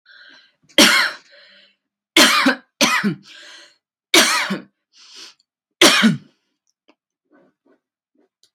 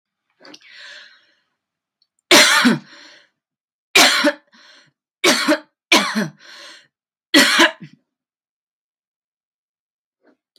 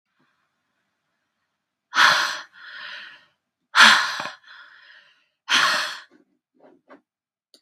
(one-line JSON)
{"cough_length": "8.5 s", "cough_amplitude": 32767, "cough_signal_mean_std_ratio": 0.37, "three_cough_length": "10.6 s", "three_cough_amplitude": 32768, "three_cough_signal_mean_std_ratio": 0.34, "exhalation_length": "7.6 s", "exhalation_amplitude": 32767, "exhalation_signal_mean_std_ratio": 0.31, "survey_phase": "beta (2021-08-13 to 2022-03-07)", "age": "18-44", "gender": "Female", "wearing_mask": "No", "symptom_cough_any": true, "symptom_sore_throat": true, "symptom_fatigue": true, "smoker_status": "Never smoked", "respiratory_condition_asthma": false, "respiratory_condition_other": false, "recruitment_source": "REACT", "submission_delay": "2 days", "covid_test_result": "Negative", "covid_test_method": "RT-qPCR", "influenza_a_test_result": "Negative", "influenza_b_test_result": "Negative"}